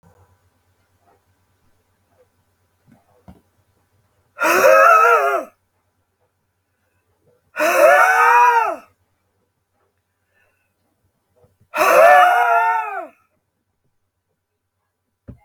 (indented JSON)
{
  "exhalation_length": "15.4 s",
  "exhalation_amplitude": 31690,
  "exhalation_signal_mean_std_ratio": 0.39,
  "survey_phase": "beta (2021-08-13 to 2022-03-07)",
  "age": "45-64",
  "gender": "Male",
  "wearing_mask": "No",
  "symptom_cough_any": true,
  "symptom_shortness_of_breath": true,
  "symptom_fatigue": true,
  "symptom_change_to_sense_of_smell_or_taste": true,
  "symptom_onset": "6 days",
  "smoker_status": "Never smoked",
  "respiratory_condition_asthma": false,
  "respiratory_condition_other": false,
  "recruitment_source": "Test and Trace",
  "submission_delay": "1 day",
  "covid_test_result": "Positive",
  "covid_test_method": "RT-qPCR",
  "covid_ct_value": 21.4,
  "covid_ct_gene": "ORF1ab gene",
  "covid_ct_mean": 22.1,
  "covid_viral_load": "56000 copies/ml",
  "covid_viral_load_category": "Low viral load (10K-1M copies/ml)"
}